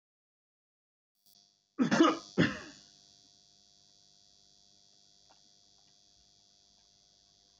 {"cough_length": "7.6 s", "cough_amplitude": 7730, "cough_signal_mean_std_ratio": 0.23, "survey_phase": "beta (2021-08-13 to 2022-03-07)", "age": "65+", "gender": "Male", "wearing_mask": "No", "symptom_fatigue": true, "smoker_status": "Never smoked", "respiratory_condition_asthma": false, "respiratory_condition_other": false, "recruitment_source": "REACT", "submission_delay": "2 days", "covid_test_result": "Negative", "covid_test_method": "RT-qPCR"}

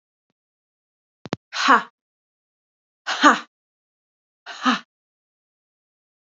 {"exhalation_length": "6.3 s", "exhalation_amplitude": 27792, "exhalation_signal_mean_std_ratio": 0.23, "survey_phase": "alpha (2021-03-01 to 2021-08-12)", "age": "45-64", "gender": "Female", "wearing_mask": "No", "symptom_cough_any": true, "symptom_shortness_of_breath": true, "symptom_abdominal_pain": true, "symptom_fatigue": true, "symptom_fever_high_temperature": true, "symptom_headache": true, "smoker_status": "Never smoked", "respiratory_condition_asthma": false, "respiratory_condition_other": false, "recruitment_source": "Test and Trace", "submission_delay": "1 day", "covid_test_result": "Positive", "covid_test_method": "RT-qPCR", "covid_ct_value": 24.1, "covid_ct_gene": "ORF1ab gene", "covid_ct_mean": 25.8, "covid_viral_load": "3600 copies/ml", "covid_viral_load_category": "Minimal viral load (< 10K copies/ml)"}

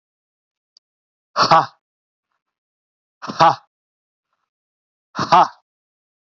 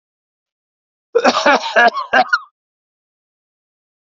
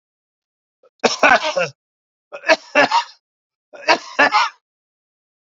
{"exhalation_length": "6.3 s", "exhalation_amplitude": 32768, "exhalation_signal_mean_std_ratio": 0.25, "cough_length": "4.0 s", "cough_amplitude": 29680, "cough_signal_mean_std_ratio": 0.37, "three_cough_length": "5.5 s", "three_cough_amplitude": 32767, "three_cough_signal_mean_std_ratio": 0.37, "survey_phase": "beta (2021-08-13 to 2022-03-07)", "age": "45-64", "gender": "Male", "wearing_mask": "No", "symptom_cough_any": true, "symptom_shortness_of_breath": true, "symptom_sore_throat": true, "symptom_change_to_sense_of_smell_or_taste": true, "symptom_onset": "4 days", "smoker_status": "Ex-smoker", "respiratory_condition_asthma": false, "respiratory_condition_other": false, "recruitment_source": "Test and Trace", "submission_delay": "1 day", "covid_test_result": "Positive", "covid_test_method": "RT-qPCR", "covid_ct_value": 28.1, "covid_ct_gene": "ORF1ab gene", "covid_ct_mean": 28.4, "covid_viral_load": "480 copies/ml", "covid_viral_load_category": "Minimal viral load (< 10K copies/ml)"}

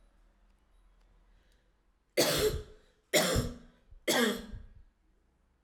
{"three_cough_length": "5.6 s", "three_cough_amplitude": 8521, "three_cough_signal_mean_std_ratio": 0.4, "survey_phase": "alpha (2021-03-01 to 2021-08-12)", "age": "18-44", "gender": "Female", "wearing_mask": "No", "symptom_cough_any": true, "symptom_diarrhoea": true, "symptom_fatigue": true, "symptom_headache": true, "symptom_change_to_sense_of_smell_or_taste": true, "symptom_loss_of_taste": true, "symptom_onset": "2 days", "smoker_status": "Ex-smoker", "respiratory_condition_asthma": false, "respiratory_condition_other": false, "recruitment_source": "Test and Trace", "submission_delay": "2 days", "covid_test_result": "Positive", "covid_test_method": "RT-qPCR", "covid_ct_value": 20.6, "covid_ct_gene": "ORF1ab gene"}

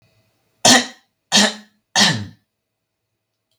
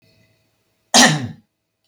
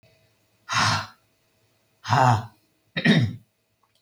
{"three_cough_length": "3.6 s", "three_cough_amplitude": 32768, "three_cough_signal_mean_std_ratio": 0.33, "cough_length": "1.9 s", "cough_amplitude": 32768, "cough_signal_mean_std_ratio": 0.31, "exhalation_length": "4.0 s", "exhalation_amplitude": 16812, "exhalation_signal_mean_std_ratio": 0.41, "survey_phase": "beta (2021-08-13 to 2022-03-07)", "age": "45-64", "gender": "Female", "wearing_mask": "No", "symptom_none": true, "smoker_status": "Ex-smoker", "respiratory_condition_asthma": false, "respiratory_condition_other": false, "recruitment_source": "REACT", "submission_delay": "4 days", "covid_test_result": "Negative", "covid_test_method": "RT-qPCR", "influenza_a_test_result": "Negative", "influenza_b_test_result": "Negative"}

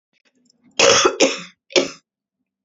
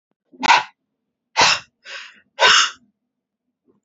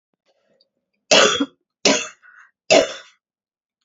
{"cough_length": "2.6 s", "cough_amplitude": 32767, "cough_signal_mean_std_ratio": 0.39, "exhalation_length": "3.8 s", "exhalation_amplitude": 29043, "exhalation_signal_mean_std_ratio": 0.35, "three_cough_length": "3.8 s", "three_cough_amplitude": 32767, "three_cough_signal_mean_std_ratio": 0.33, "survey_phase": "beta (2021-08-13 to 2022-03-07)", "age": "45-64", "gender": "Female", "wearing_mask": "No", "symptom_cough_any": true, "symptom_shortness_of_breath": true, "symptom_fatigue": true, "symptom_onset": "12 days", "smoker_status": "Never smoked", "respiratory_condition_asthma": false, "respiratory_condition_other": false, "recruitment_source": "REACT", "submission_delay": "3 days", "covid_test_result": "Positive", "covid_test_method": "RT-qPCR", "covid_ct_value": 37.0, "covid_ct_gene": "N gene", "influenza_a_test_result": "Negative", "influenza_b_test_result": "Negative"}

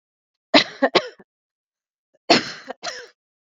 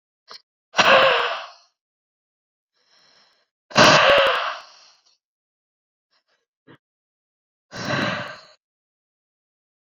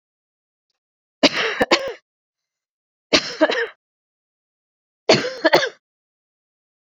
{"cough_length": "3.5 s", "cough_amplitude": 28484, "cough_signal_mean_std_ratio": 0.27, "exhalation_length": "10.0 s", "exhalation_amplitude": 28715, "exhalation_signal_mean_std_ratio": 0.32, "three_cough_length": "7.0 s", "three_cough_amplitude": 31508, "three_cough_signal_mean_std_ratio": 0.31, "survey_phase": "beta (2021-08-13 to 2022-03-07)", "age": "18-44", "gender": "Female", "wearing_mask": "No", "symptom_fatigue": true, "symptom_onset": "12 days", "smoker_status": "Never smoked", "respiratory_condition_asthma": false, "respiratory_condition_other": false, "recruitment_source": "REACT", "submission_delay": "1 day", "covid_test_result": "Negative", "covid_test_method": "RT-qPCR"}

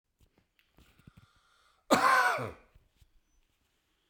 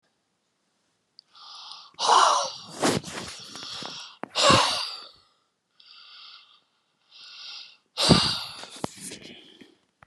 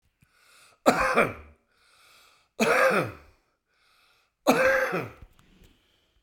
{"cough_length": "4.1 s", "cough_amplitude": 11133, "cough_signal_mean_std_ratio": 0.3, "exhalation_length": "10.1 s", "exhalation_amplitude": 32374, "exhalation_signal_mean_std_ratio": 0.38, "three_cough_length": "6.2 s", "three_cough_amplitude": 21471, "three_cough_signal_mean_std_ratio": 0.41, "survey_phase": "beta (2021-08-13 to 2022-03-07)", "age": "65+", "gender": "Male", "wearing_mask": "No", "symptom_none": true, "smoker_status": "Never smoked", "respiratory_condition_asthma": false, "respiratory_condition_other": true, "recruitment_source": "REACT", "submission_delay": "3 days", "covid_test_result": "Negative", "covid_test_method": "RT-qPCR", "influenza_a_test_result": "Negative", "influenza_b_test_result": "Negative"}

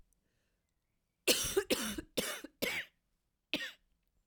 {"cough_length": "4.3 s", "cough_amplitude": 7226, "cough_signal_mean_std_ratio": 0.39, "survey_phase": "alpha (2021-03-01 to 2021-08-12)", "age": "45-64", "gender": "Female", "wearing_mask": "No", "symptom_cough_any": true, "symptom_abdominal_pain": true, "symptom_fatigue": true, "symptom_fever_high_temperature": true, "symptom_headache": true, "symptom_change_to_sense_of_smell_or_taste": true, "smoker_status": "Never smoked", "respiratory_condition_asthma": false, "respiratory_condition_other": false, "recruitment_source": "Test and Trace", "submission_delay": "1 day", "covid_test_result": "Positive", "covid_test_method": "RT-qPCR", "covid_ct_value": 19.1, "covid_ct_gene": "ORF1ab gene", "covid_ct_mean": 19.6, "covid_viral_load": "380000 copies/ml", "covid_viral_load_category": "Low viral load (10K-1M copies/ml)"}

